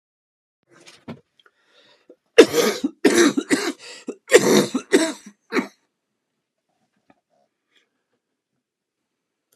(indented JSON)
{
  "cough_length": "9.6 s",
  "cough_amplitude": 32768,
  "cough_signal_mean_std_ratio": 0.3,
  "survey_phase": "beta (2021-08-13 to 2022-03-07)",
  "age": "65+",
  "gender": "Male",
  "wearing_mask": "No",
  "symptom_cough_any": true,
  "symptom_runny_or_blocked_nose": true,
  "symptom_sore_throat": true,
  "symptom_onset": "3 days",
  "smoker_status": "Ex-smoker",
  "respiratory_condition_asthma": false,
  "respiratory_condition_other": false,
  "recruitment_source": "Test and Trace",
  "submission_delay": "2 days",
  "covid_test_result": "Positive",
  "covid_test_method": "RT-qPCR"
}